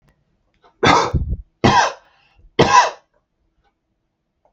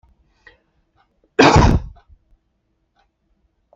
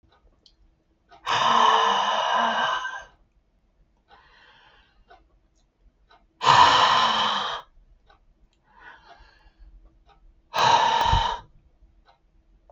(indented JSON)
{
  "three_cough_length": "4.5 s",
  "three_cough_amplitude": 32768,
  "three_cough_signal_mean_std_ratio": 0.38,
  "cough_length": "3.8 s",
  "cough_amplitude": 32768,
  "cough_signal_mean_std_ratio": 0.28,
  "exhalation_length": "12.7 s",
  "exhalation_amplitude": 24282,
  "exhalation_signal_mean_std_ratio": 0.45,
  "survey_phase": "beta (2021-08-13 to 2022-03-07)",
  "age": "65+",
  "gender": "Male",
  "wearing_mask": "No",
  "symptom_none": true,
  "smoker_status": "Never smoked",
  "respiratory_condition_asthma": false,
  "respiratory_condition_other": false,
  "recruitment_source": "REACT",
  "submission_delay": "1 day",
  "covid_test_result": "Negative",
  "covid_test_method": "RT-qPCR",
  "influenza_a_test_result": "Negative",
  "influenza_b_test_result": "Negative"
}